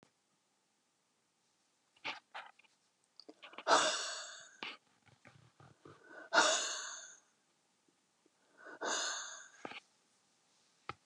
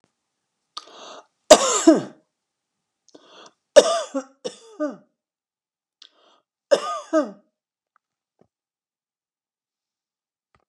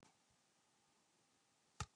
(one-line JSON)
{"exhalation_length": "11.1 s", "exhalation_amplitude": 6083, "exhalation_signal_mean_std_ratio": 0.32, "three_cough_length": "10.7 s", "three_cough_amplitude": 32768, "three_cough_signal_mean_std_ratio": 0.22, "cough_length": "2.0 s", "cough_amplitude": 1088, "cough_signal_mean_std_ratio": 0.21, "survey_phase": "alpha (2021-03-01 to 2021-08-12)", "age": "65+", "gender": "Female", "wearing_mask": "No", "symptom_none": true, "smoker_status": "Ex-smoker", "respiratory_condition_asthma": false, "respiratory_condition_other": false, "recruitment_source": "REACT", "submission_delay": "31 days", "covid_test_result": "Negative", "covid_test_method": "RT-qPCR"}